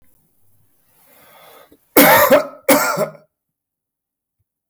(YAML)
cough_length: 4.7 s
cough_amplitude: 32768
cough_signal_mean_std_ratio: 0.35
survey_phase: beta (2021-08-13 to 2022-03-07)
age: 65+
gender: Male
wearing_mask: 'No'
symptom_cough_any: true
symptom_onset: 12 days
smoker_status: Never smoked
respiratory_condition_asthma: false
respiratory_condition_other: false
recruitment_source: REACT
submission_delay: 0 days
covid_test_result: Positive
covid_test_method: RT-qPCR
covid_ct_value: 23.0
covid_ct_gene: E gene
influenza_a_test_result: Negative
influenza_b_test_result: Negative